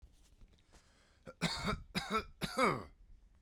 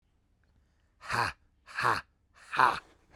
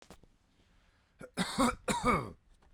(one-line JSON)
{"three_cough_length": "3.4 s", "three_cough_amplitude": 4574, "three_cough_signal_mean_std_ratio": 0.45, "exhalation_length": "3.2 s", "exhalation_amplitude": 14595, "exhalation_signal_mean_std_ratio": 0.34, "cough_length": "2.7 s", "cough_amplitude": 5409, "cough_signal_mean_std_ratio": 0.42, "survey_phase": "beta (2021-08-13 to 2022-03-07)", "age": "18-44", "gender": "Male", "wearing_mask": "No", "symptom_none": true, "smoker_status": "Never smoked", "respiratory_condition_asthma": false, "respiratory_condition_other": false, "recruitment_source": "REACT", "submission_delay": "0 days", "covid_test_result": "Negative", "covid_test_method": "RT-qPCR", "influenza_a_test_result": "Negative", "influenza_b_test_result": "Negative"}